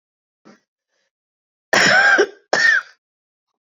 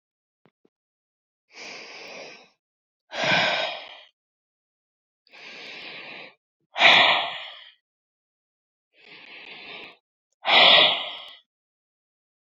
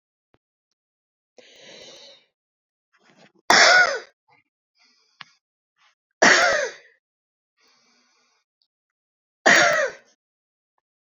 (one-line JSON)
{"cough_length": "3.8 s", "cough_amplitude": 27867, "cough_signal_mean_std_ratio": 0.41, "exhalation_length": "12.5 s", "exhalation_amplitude": 23994, "exhalation_signal_mean_std_ratio": 0.31, "three_cough_length": "11.2 s", "three_cough_amplitude": 28834, "three_cough_signal_mean_std_ratio": 0.28, "survey_phase": "beta (2021-08-13 to 2022-03-07)", "age": "45-64", "gender": "Female", "wearing_mask": "No", "symptom_cough_any": true, "symptom_runny_or_blocked_nose": true, "symptom_sore_throat": true, "symptom_fatigue": true, "symptom_onset": "4 days", "smoker_status": "Never smoked", "respiratory_condition_asthma": false, "respiratory_condition_other": false, "recruitment_source": "Test and Trace", "submission_delay": "2 days", "covid_test_result": "Positive", "covid_test_method": "ePCR"}